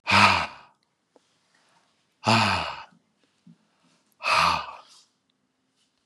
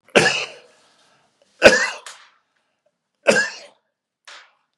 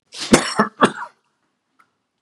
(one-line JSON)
{"exhalation_length": "6.1 s", "exhalation_amplitude": 18909, "exhalation_signal_mean_std_ratio": 0.36, "three_cough_length": "4.8 s", "three_cough_amplitude": 32768, "three_cough_signal_mean_std_ratio": 0.29, "cough_length": "2.2 s", "cough_amplitude": 32768, "cough_signal_mean_std_ratio": 0.32, "survey_phase": "beta (2021-08-13 to 2022-03-07)", "age": "65+", "gender": "Male", "wearing_mask": "No", "symptom_none": true, "smoker_status": "Never smoked", "respiratory_condition_asthma": false, "respiratory_condition_other": false, "recruitment_source": "REACT", "submission_delay": "1 day", "covid_test_result": "Negative", "covid_test_method": "RT-qPCR", "influenza_a_test_result": "Negative", "influenza_b_test_result": "Negative"}